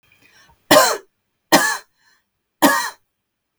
{"three_cough_length": "3.6 s", "three_cough_amplitude": 32768, "three_cough_signal_mean_std_ratio": 0.35, "survey_phase": "beta (2021-08-13 to 2022-03-07)", "age": "45-64", "gender": "Female", "wearing_mask": "No", "symptom_none": true, "smoker_status": "Never smoked", "respiratory_condition_asthma": false, "respiratory_condition_other": false, "recruitment_source": "REACT", "submission_delay": "2 days", "covid_test_result": "Negative", "covid_test_method": "RT-qPCR", "influenza_a_test_result": "Negative", "influenza_b_test_result": "Negative"}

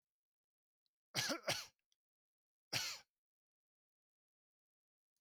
{"cough_length": "5.2 s", "cough_amplitude": 2618, "cough_signal_mean_std_ratio": 0.27, "survey_phase": "beta (2021-08-13 to 2022-03-07)", "age": "45-64", "gender": "Male", "wearing_mask": "No", "symptom_none": true, "smoker_status": "Never smoked", "respiratory_condition_asthma": false, "respiratory_condition_other": false, "recruitment_source": "REACT", "submission_delay": "2 days", "covid_test_result": "Negative", "covid_test_method": "RT-qPCR", "influenza_a_test_result": "Negative", "influenza_b_test_result": "Negative"}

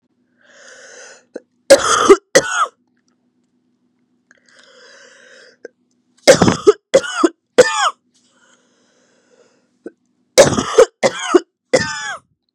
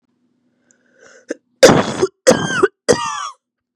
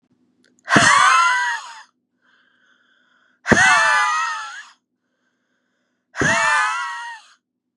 {"three_cough_length": "12.5 s", "three_cough_amplitude": 32768, "three_cough_signal_mean_std_ratio": 0.32, "cough_length": "3.8 s", "cough_amplitude": 32768, "cough_signal_mean_std_ratio": 0.37, "exhalation_length": "7.8 s", "exhalation_amplitude": 32767, "exhalation_signal_mean_std_ratio": 0.49, "survey_phase": "beta (2021-08-13 to 2022-03-07)", "age": "18-44", "gender": "Female", "wearing_mask": "No", "symptom_cough_any": true, "symptom_new_continuous_cough": true, "symptom_runny_or_blocked_nose": true, "symptom_sore_throat": true, "symptom_fatigue": true, "symptom_fever_high_temperature": true, "symptom_headache": true, "symptom_onset": "2 days", "smoker_status": "Never smoked", "respiratory_condition_asthma": false, "respiratory_condition_other": false, "recruitment_source": "Test and Trace", "submission_delay": "2 days", "covid_test_result": "Positive", "covid_test_method": "RT-qPCR", "covid_ct_value": 26.3, "covid_ct_gene": "ORF1ab gene", "covid_ct_mean": 26.7, "covid_viral_load": "1800 copies/ml", "covid_viral_load_category": "Minimal viral load (< 10K copies/ml)"}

